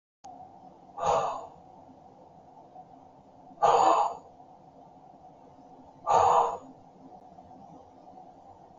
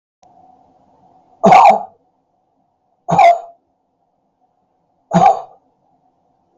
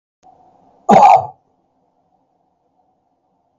exhalation_length: 8.8 s
exhalation_amplitude: 10084
exhalation_signal_mean_std_ratio: 0.38
three_cough_length: 6.6 s
three_cough_amplitude: 32768
three_cough_signal_mean_std_ratio: 0.31
cough_length: 3.6 s
cough_amplitude: 32768
cough_signal_mean_std_ratio: 0.26
survey_phase: beta (2021-08-13 to 2022-03-07)
age: 65+
gender: Male
wearing_mask: 'No'
symptom_none: true
smoker_status: Ex-smoker
respiratory_condition_asthma: false
respiratory_condition_other: false
recruitment_source: REACT
submission_delay: 0 days
covid_test_result: Negative
covid_test_method: RT-qPCR
influenza_a_test_result: Negative
influenza_b_test_result: Negative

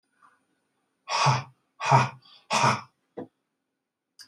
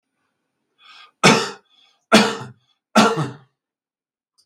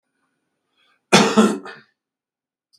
exhalation_length: 4.3 s
exhalation_amplitude: 19957
exhalation_signal_mean_std_ratio: 0.36
three_cough_length: 4.5 s
three_cough_amplitude: 32768
three_cough_signal_mean_std_ratio: 0.32
cough_length: 2.8 s
cough_amplitude: 32768
cough_signal_mean_std_ratio: 0.3
survey_phase: beta (2021-08-13 to 2022-03-07)
age: 65+
gender: Male
wearing_mask: 'No'
symptom_none: true
smoker_status: Ex-smoker
respiratory_condition_asthma: false
respiratory_condition_other: false
recruitment_source: REACT
submission_delay: 2 days
covid_test_result: Negative
covid_test_method: RT-qPCR
influenza_a_test_result: Negative
influenza_b_test_result: Negative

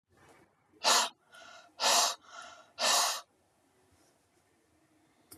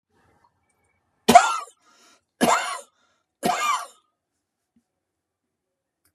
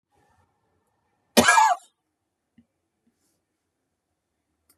exhalation_length: 5.4 s
exhalation_amplitude: 7008
exhalation_signal_mean_std_ratio: 0.37
three_cough_length: 6.1 s
three_cough_amplitude: 32759
three_cough_signal_mean_std_ratio: 0.26
cough_length: 4.8 s
cough_amplitude: 32250
cough_signal_mean_std_ratio: 0.22
survey_phase: beta (2021-08-13 to 2022-03-07)
age: 65+
gender: Male
wearing_mask: 'No'
symptom_none: true
smoker_status: Ex-smoker
respiratory_condition_asthma: false
respiratory_condition_other: false
recruitment_source: REACT
submission_delay: 3 days
covid_test_result: Negative
covid_test_method: RT-qPCR
influenza_a_test_result: Negative
influenza_b_test_result: Negative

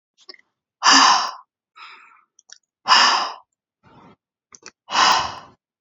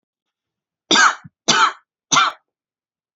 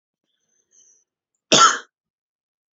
exhalation_length: 5.8 s
exhalation_amplitude: 31391
exhalation_signal_mean_std_ratio: 0.38
three_cough_length: 3.2 s
three_cough_amplitude: 32768
three_cough_signal_mean_std_ratio: 0.37
cough_length: 2.7 s
cough_amplitude: 32768
cough_signal_mean_std_ratio: 0.23
survey_phase: beta (2021-08-13 to 2022-03-07)
age: 18-44
gender: Female
wearing_mask: 'No'
symptom_none: true
smoker_status: Never smoked
respiratory_condition_asthma: false
respiratory_condition_other: false
recruitment_source: REACT
submission_delay: 14 days
covid_test_result: Negative
covid_test_method: RT-qPCR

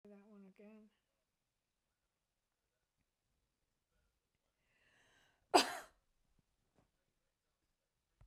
cough_length: 8.3 s
cough_amplitude: 7137
cough_signal_mean_std_ratio: 0.12
survey_phase: beta (2021-08-13 to 2022-03-07)
age: 65+
gender: Female
wearing_mask: 'No'
symptom_none: true
smoker_status: Ex-smoker
respiratory_condition_asthma: false
respiratory_condition_other: false
recruitment_source: REACT
submission_delay: 5 days
covid_test_result: Negative
covid_test_method: RT-qPCR
influenza_a_test_result: Negative
influenza_b_test_result: Negative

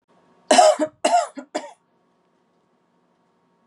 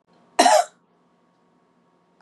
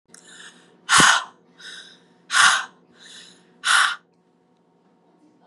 three_cough_length: 3.7 s
three_cough_amplitude: 28545
three_cough_signal_mean_std_ratio: 0.32
cough_length: 2.2 s
cough_amplitude: 26780
cough_signal_mean_std_ratio: 0.28
exhalation_length: 5.5 s
exhalation_amplitude: 27336
exhalation_signal_mean_std_ratio: 0.35
survey_phase: beta (2021-08-13 to 2022-03-07)
age: 18-44
gender: Female
wearing_mask: 'No'
symptom_cough_any: true
symptom_runny_or_blocked_nose: true
symptom_onset: 5 days
smoker_status: Never smoked
respiratory_condition_asthma: true
respiratory_condition_other: false
recruitment_source: REACT
submission_delay: 2 days
covid_test_result: Negative
covid_test_method: RT-qPCR
influenza_a_test_result: Negative
influenza_b_test_result: Negative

